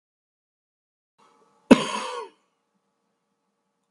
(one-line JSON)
{"cough_length": "3.9 s", "cough_amplitude": 32756, "cough_signal_mean_std_ratio": 0.16, "survey_phase": "beta (2021-08-13 to 2022-03-07)", "age": "65+", "gender": "Male", "wearing_mask": "No", "symptom_cough_any": true, "symptom_runny_or_blocked_nose": true, "symptom_sore_throat": true, "smoker_status": "Ex-smoker", "respiratory_condition_asthma": false, "respiratory_condition_other": false, "recruitment_source": "Test and Trace", "submission_delay": "1 day", "covid_test_result": "Positive", "covid_test_method": "LFT"}